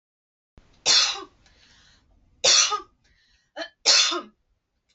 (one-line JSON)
{"three_cough_length": "4.9 s", "three_cough_amplitude": 22151, "three_cough_signal_mean_std_ratio": 0.36, "survey_phase": "beta (2021-08-13 to 2022-03-07)", "age": "18-44", "gender": "Female", "wearing_mask": "No", "symptom_none": true, "smoker_status": "Never smoked", "respiratory_condition_asthma": false, "respiratory_condition_other": false, "recruitment_source": "REACT", "submission_delay": "1 day", "covid_test_result": "Negative", "covid_test_method": "RT-qPCR"}